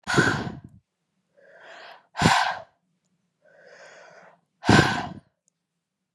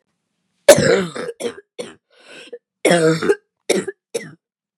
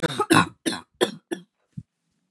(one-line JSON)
{"exhalation_length": "6.1 s", "exhalation_amplitude": 23553, "exhalation_signal_mean_std_ratio": 0.34, "cough_length": "4.8 s", "cough_amplitude": 32768, "cough_signal_mean_std_ratio": 0.39, "three_cough_length": "2.3 s", "three_cough_amplitude": 22655, "three_cough_signal_mean_std_ratio": 0.37, "survey_phase": "beta (2021-08-13 to 2022-03-07)", "age": "18-44", "gender": "Female", "wearing_mask": "No", "symptom_cough_any": true, "symptom_runny_or_blocked_nose": true, "symptom_shortness_of_breath": true, "symptom_sore_throat": true, "symptom_fatigue": true, "symptom_headache": true, "symptom_onset": "3 days", "smoker_status": "Never smoked", "respiratory_condition_asthma": false, "respiratory_condition_other": false, "recruitment_source": "Test and Trace", "submission_delay": "1 day", "covid_test_result": "Positive", "covid_test_method": "RT-qPCR", "covid_ct_value": 18.3, "covid_ct_gene": "ORF1ab gene"}